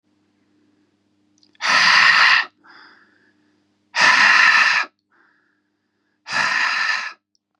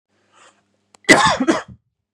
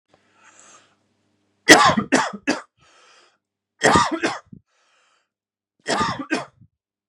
{"exhalation_length": "7.6 s", "exhalation_amplitude": 29366, "exhalation_signal_mean_std_ratio": 0.48, "cough_length": "2.1 s", "cough_amplitude": 32768, "cough_signal_mean_std_ratio": 0.35, "three_cough_length": "7.1 s", "three_cough_amplitude": 32768, "three_cough_signal_mean_std_ratio": 0.32, "survey_phase": "beta (2021-08-13 to 2022-03-07)", "age": "18-44", "gender": "Male", "wearing_mask": "No", "symptom_none": true, "smoker_status": "Never smoked", "respiratory_condition_asthma": false, "respiratory_condition_other": false, "recruitment_source": "REACT", "submission_delay": "2 days", "covid_test_result": "Negative", "covid_test_method": "RT-qPCR", "influenza_a_test_result": "Negative", "influenza_b_test_result": "Negative"}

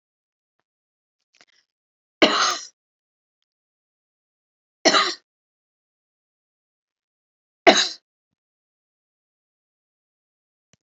{"three_cough_length": "10.9 s", "three_cough_amplitude": 29576, "three_cough_signal_mean_std_ratio": 0.19, "survey_phase": "beta (2021-08-13 to 2022-03-07)", "age": "65+", "gender": "Female", "wearing_mask": "No", "symptom_cough_any": true, "symptom_diarrhoea": true, "symptom_fatigue": true, "symptom_fever_high_temperature": true, "symptom_change_to_sense_of_smell_or_taste": true, "symptom_loss_of_taste": true, "symptom_onset": "3 days", "smoker_status": "Never smoked", "respiratory_condition_asthma": true, "respiratory_condition_other": false, "recruitment_source": "Test and Trace", "submission_delay": "2 days", "covid_test_result": "Positive", "covid_test_method": "RT-qPCR"}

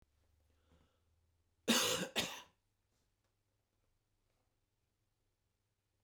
{"cough_length": "6.0 s", "cough_amplitude": 3945, "cough_signal_mean_std_ratio": 0.24, "survey_phase": "beta (2021-08-13 to 2022-03-07)", "age": "65+", "gender": "Male", "wearing_mask": "No", "symptom_cough_any": true, "symptom_runny_or_blocked_nose": true, "symptom_onset": "12 days", "smoker_status": "Never smoked", "respiratory_condition_asthma": false, "respiratory_condition_other": false, "recruitment_source": "REACT", "submission_delay": "3 days", "covid_test_result": "Negative", "covid_test_method": "RT-qPCR", "influenza_a_test_result": "Negative", "influenza_b_test_result": "Negative"}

